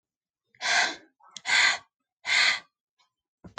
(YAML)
exhalation_length: 3.6 s
exhalation_amplitude: 11376
exhalation_signal_mean_std_ratio: 0.42
survey_phase: alpha (2021-03-01 to 2021-08-12)
age: 18-44
gender: Female
wearing_mask: 'No'
symptom_none: true
smoker_status: Never smoked
respiratory_condition_asthma: false
respiratory_condition_other: false
recruitment_source: REACT
submission_delay: 2 days
covid_test_result: Negative
covid_test_method: RT-qPCR